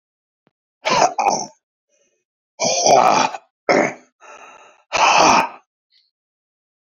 {"exhalation_length": "6.8 s", "exhalation_amplitude": 27682, "exhalation_signal_mean_std_ratio": 0.44, "survey_phase": "beta (2021-08-13 to 2022-03-07)", "age": "45-64", "gender": "Male", "wearing_mask": "No", "symptom_cough_any": true, "symptom_new_continuous_cough": true, "symptom_runny_or_blocked_nose": true, "symptom_fatigue": true, "symptom_headache": true, "smoker_status": "Ex-smoker", "respiratory_condition_asthma": false, "respiratory_condition_other": false, "recruitment_source": "Test and Trace", "submission_delay": "2 days", "covid_test_result": "Positive", "covid_test_method": "RT-qPCR", "covid_ct_value": 17.4, "covid_ct_gene": "ORF1ab gene", "covid_ct_mean": 18.1, "covid_viral_load": "1200000 copies/ml", "covid_viral_load_category": "High viral load (>1M copies/ml)"}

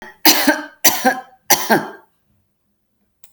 {"three_cough_length": "3.3 s", "three_cough_amplitude": 32768, "three_cough_signal_mean_std_ratio": 0.41, "survey_phase": "alpha (2021-03-01 to 2021-08-12)", "age": "45-64", "gender": "Female", "wearing_mask": "No", "symptom_none": true, "smoker_status": "Ex-smoker", "respiratory_condition_asthma": false, "respiratory_condition_other": false, "recruitment_source": "REACT", "submission_delay": "1 day", "covid_test_result": "Negative", "covid_test_method": "RT-qPCR"}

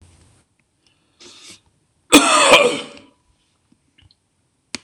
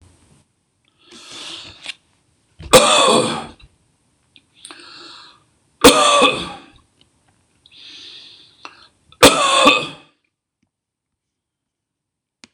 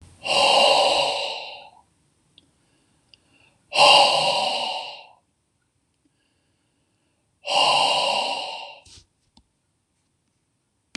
{"cough_length": "4.8 s", "cough_amplitude": 26028, "cough_signal_mean_std_ratio": 0.3, "three_cough_length": "12.5 s", "three_cough_amplitude": 26028, "three_cough_signal_mean_std_ratio": 0.32, "exhalation_length": "11.0 s", "exhalation_amplitude": 24946, "exhalation_signal_mean_std_ratio": 0.44, "survey_phase": "beta (2021-08-13 to 2022-03-07)", "age": "45-64", "gender": "Male", "wearing_mask": "No", "symptom_none": true, "smoker_status": "Never smoked", "respiratory_condition_asthma": false, "respiratory_condition_other": false, "recruitment_source": "REACT", "submission_delay": "2 days", "covid_test_result": "Negative", "covid_test_method": "RT-qPCR"}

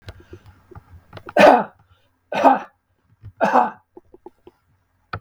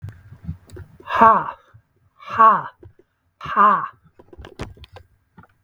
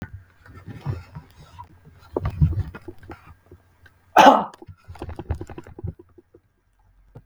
{"three_cough_length": "5.2 s", "three_cough_amplitude": 32768, "three_cough_signal_mean_std_ratio": 0.31, "exhalation_length": "5.6 s", "exhalation_amplitude": 32766, "exhalation_signal_mean_std_ratio": 0.35, "cough_length": "7.3 s", "cough_amplitude": 32768, "cough_signal_mean_std_ratio": 0.28, "survey_phase": "beta (2021-08-13 to 2022-03-07)", "age": "65+", "gender": "Male", "wearing_mask": "No", "symptom_none": true, "smoker_status": "Never smoked", "respiratory_condition_asthma": false, "respiratory_condition_other": false, "recruitment_source": "REACT", "submission_delay": "2 days", "covid_test_result": "Negative", "covid_test_method": "RT-qPCR"}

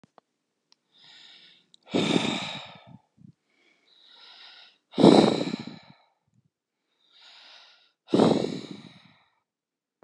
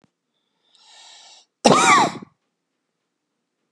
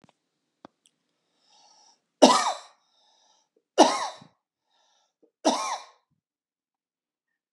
{"exhalation_length": "10.0 s", "exhalation_amplitude": 25966, "exhalation_signal_mean_std_ratio": 0.28, "cough_length": "3.7 s", "cough_amplitude": 32768, "cough_signal_mean_std_ratio": 0.29, "three_cough_length": "7.5 s", "three_cough_amplitude": 28389, "three_cough_signal_mean_std_ratio": 0.23, "survey_phase": "beta (2021-08-13 to 2022-03-07)", "age": "45-64", "gender": "Male", "wearing_mask": "No", "symptom_cough_any": true, "smoker_status": "Never smoked", "respiratory_condition_asthma": false, "respiratory_condition_other": false, "recruitment_source": "REACT", "submission_delay": "2 days", "covid_test_result": "Negative", "covid_test_method": "RT-qPCR", "influenza_a_test_result": "Unknown/Void", "influenza_b_test_result": "Unknown/Void"}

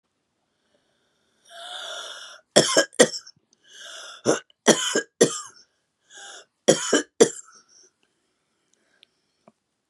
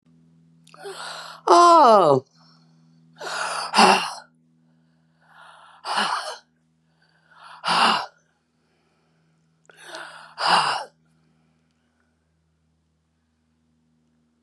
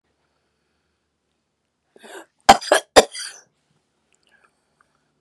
{"three_cough_length": "9.9 s", "three_cough_amplitude": 31743, "three_cough_signal_mean_std_ratio": 0.28, "exhalation_length": "14.4 s", "exhalation_amplitude": 29417, "exhalation_signal_mean_std_ratio": 0.32, "cough_length": "5.2 s", "cough_amplitude": 32768, "cough_signal_mean_std_ratio": 0.17, "survey_phase": "beta (2021-08-13 to 2022-03-07)", "age": "65+", "gender": "Female", "wearing_mask": "No", "symptom_none": true, "smoker_status": "Ex-smoker", "respiratory_condition_asthma": false, "respiratory_condition_other": true, "recruitment_source": "REACT", "submission_delay": "1 day", "covid_test_result": "Negative", "covid_test_method": "RT-qPCR"}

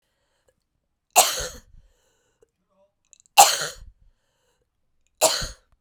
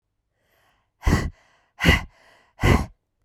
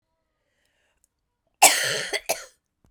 {"three_cough_length": "5.8 s", "three_cough_amplitude": 32768, "three_cough_signal_mean_std_ratio": 0.24, "exhalation_length": "3.2 s", "exhalation_amplitude": 23222, "exhalation_signal_mean_std_ratio": 0.35, "cough_length": "2.9 s", "cough_amplitude": 32767, "cough_signal_mean_std_ratio": 0.29, "survey_phase": "beta (2021-08-13 to 2022-03-07)", "age": "45-64", "gender": "Female", "wearing_mask": "No", "symptom_cough_any": true, "symptom_runny_or_blocked_nose": true, "symptom_sore_throat": true, "symptom_loss_of_taste": true, "smoker_status": "Prefer not to say", "respiratory_condition_asthma": false, "respiratory_condition_other": false, "recruitment_source": "Test and Trace", "submission_delay": "2 days", "covid_test_result": "Positive", "covid_test_method": "RT-qPCR", "covid_ct_value": 13.6, "covid_ct_gene": "ORF1ab gene", "covid_ct_mean": 14.1, "covid_viral_load": "24000000 copies/ml", "covid_viral_load_category": "High viral load (>1M copies/ml)"}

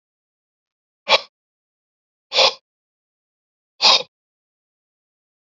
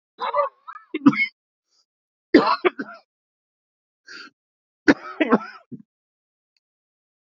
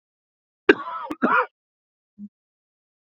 {"exhalation_length": "5.5 s", "exhalation_amplitude": 31767, "exhalation_signal_mean_std_ratio": 0.22, "three_cough_length": "7.3 s", "three_cough_amplitude": 32768, "three_cough_signal_mean_std_ratio": 0.27, "cough_length": "3.2 s", "cough_amplitude": 32768, "cough_signal_mean_std_ratio": 0.26, "survey_phase": "beta (2021-08-13 to 2022-03-07)", "age": "65+", "gender": "Male", "wearing_mask": "No", "symptom_cough_any": true, "smoker_status": "Never smoked", "respiratory_condition_asthma": false, "respiratory_condition_other": false, "recruitment_source": "Test and Trace", "submission_delay": "1 day", "covid_test_result": "Positive", "covid_test_method": "LFT"}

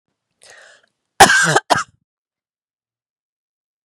{"cough_length": "3.8 s", "cough_amplitude": 32768, "cough_signal_mean_std_ratio": 0.26, "survey_phase": "beta (2021-08-13 to 2022-03-07)", "age": "45-64", "gender": "Female", "wearing_mask": "No", "symptom_none": true, "symptom_onset": "4 days", "smoker_status": "Never smoked", "respiratory_condition_asthma": false, "respiratory_condition_other": false, "recruitment_source": "REACT", "submission_delay": "3 days", "covid_test_result": "Negative", "covid_test_method": "RT-qPCR", "influenza_a_test_result": "Negative", "influenza_b_test_result": "Negative"}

